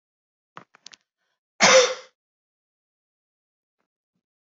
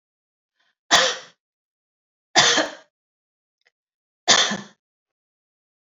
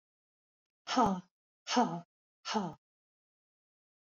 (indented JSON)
{
  "cough_length": "4.5 s",
  "cough_amplitude": 27026,
  "cough_signal_mean_std_ratio": 0.21,
  "three_cough_length": "6.0 s",
  "three_cough_amplitude": 29282,
  "three_cough_signal_mean_std_ratio": 0.29,
  "exhalation_length": "4.0 s",
  "exhalation_amplitude": 5403,
  "exhalation_signal_mean_std_ratio": 0.34,
  "survey_phase": "alpha (2021-03-01 to 2021-08-12)",
  "age": "65+",
  "gender": "Female",
  "wearing_mask": "No",
  "symptom_none": true,
  "smoker_status": "Never smoked",
  "respiratory_condition_asthma": false,
  "respiratory_condition_other": false,
  "recruitment_source": "REACT",
  "submission_delay": "2 days",
  "covid_test_result": "Negative",
  "covid_test_method": "RT-qPCR"
}